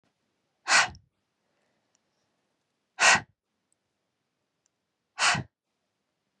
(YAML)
exhalation_length: 6.4 s
exhalation_amplitude: 16948
exhalation_signal_mean_std_ratio: 0.24
survey_phase: beta (2021-08-13 to 2022-03-07)
age: 45-64
gender: Female
wearing_mask: 'No'
symptom_none: true
smoker_status: Never smoked
respiratory_condition_asthma: false
respiratory_condition_other: false
recruitment_source: REACT
submission_delay: 2 days
covid_test_result: Negative
covid_test_method: RT-qPCR